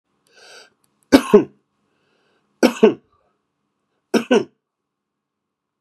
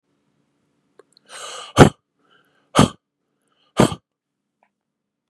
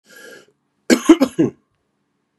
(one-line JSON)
{"three_cough_length": "5.8 s", "three_cough_amplitude": 32768, "three_cough_signal_mean_std_ratio": 0.24, "exhalation_length": "5.3 s", "exhalation_amplitude": 32768, "exhalation_signal_mean_std_ratio": 0.2, "cough_length": "2.4 s", "cough_amplitude": 32768, "cough_signal_mean_std_ratio": 0.29, "survey_phase": "beta (2021-08-13 to 2022-03-07)", "age": "45-64", "gender": "Male", "wearing_mask": "No", "symptom_cough_any": true, "symptom_new_continuous_cough": true, "symptom_runny_or_blocked_nose": true, "symptom_fatigue": true, "symptom_fever_high_temperature": true, "symptom_headache": true, "symptom_onset": "3 days", "smoker_status": "Never smoked", "respiratory_condition_asthma": false, "respiratory_condition_other": false, "recruitment_source": "Test and Trace", "submission_delay": "1 day", "covid_test_result": "Positive", "covid_test_method": "RT-qPCR", "covid_ct_value": 19.2, "covid_ct_gene": "ORF1ab gene"}